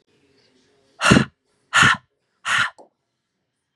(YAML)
exhalation_length: 3.8 s
exhalation_amplitude: 32768
exhalation_signal_mean_std_ratio: 0.32
survey_phase: beta (2021-08-13 to 2022-03-07)
age: 18-44
gender: Female
wearing_mask: 'No'
symptom_cough_any: true
symptom_runny_or_blocked_nose: true
symptom_change_to_sense_of_smell_or_taste: true
symptom_loss_of_taste: true
symptom_onset: 7 days
smoker_status: Never smoked
respiratory_condition_asthma: false
respiratory_condition_other: false
recruitment_source: Test and Trace
submission_delay: 1 day
covid_test_result: Positive
covid_test_method: RT-qPCR